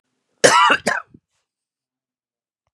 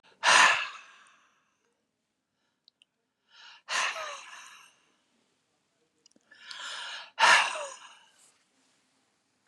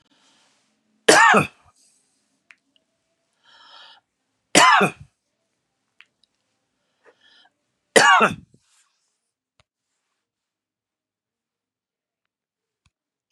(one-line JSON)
{"cough_length": "2.7 s", "cough_amplitude": 32768, "cough_signal_mean_std_ratio": 0.31, "exhalation_length": "9.5 s", "exhalation_amplitude": 14989, "exhalation_signal_mean_std_ratio": 0.29, "three_cough_length": "13.3 s", "three_cough_amplitude": 32768, "three_cough_signal_mean_std_ratio": 0.23, "survey_phase": "beta (2021-08-13 to 2022-03-07)", "age": "65+", "gender": "Male", "wearing_mask": "No", "symptom_headache": true, "smoker_status": "Never smoked", "respiratory_condition_asthma": false, "respiratory_condition_other": false, "recruitment_source": "REACT", "submission_delay": "1 day", "covid_test_result": "Negative", "covid_test_method": "RT-qPCR"}